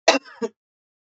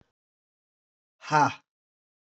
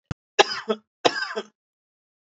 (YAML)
cough_length: 1.0 s
cough_amplitude: 30281
cough_signal_mean_std_ratio: 0.28
exhalation_length: 2.3 s
exhalation_amplitude: 12348
exhalation_signal_mean_std_ratio: 0.24
three_cough_length: 2.2 s
three_cough_amplitude: 32768
three_cough_signal_mean_std_ratio: 0.29
survey_phase: beta (2021-08-13 to 2022-03-07)
age: 45-64
gender: Male
wearing_mask: 'No'
symptom_cough_any: true
symptom_new_continuous_cough: true
symptom_shortness_of_breath: true
symptom_fatigue: true
symptom_headache: true
symptom_onset: 5 days
smoker_status: Never smoked
respiratory_condition_asthma: false
respiratory_condition_other: false
recruitment_source: Test and Trace
submission_delay: 2 days
covid_test_result: Positive
covid_test_method: RT-qPCR
covid_ct_value: 19.3
covid_ct_gene: N gene